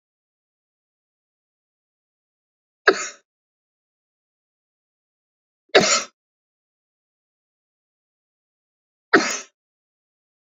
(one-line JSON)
{"three_cough_length": "10.5 s", "three_cough_amplitude": 28106, "three_cough_signal_mean_std_ratio": 0.17, "survey_phase": "beta (2021-08-13 to 2022-03-07)", "age": "45-64", "gender": "Male", "wearing_mask": "No", "symptom_none": true, "smoker_status": "Ex-smoker", "respiratory_condition_asthma": false, "respiratory_condition_other": false, "recruitment_source": "Test and Trace", "submission_delay": "1 day", "covid_test_result": "Positive", "covid_test_method": "RT-qPCR"}